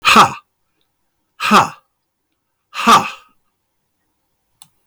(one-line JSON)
{"exhalation_length": "4.9 s", "exhalation_amplitude": 32768, "exhalation_signal_mean_std_ratio": 0.32, "survey_phase": "beta (2021-08-13 to 2022-03-07)", "age": "65+", "gender": "Male", "wearing_mask": "No", "symptom_none": true, "smoker_status": "Ex-smoker", "respiratory_condition_asthma": false, "respiratory_condition_other": false, "recruitment_source": "REACT", "submission_delay": "2 days", "covid_test_result": "Negative", "covid_test_method": "RT-qPCR", "influenza_a_test_result": "Negative", "influenza_b_test_result": "Negative"}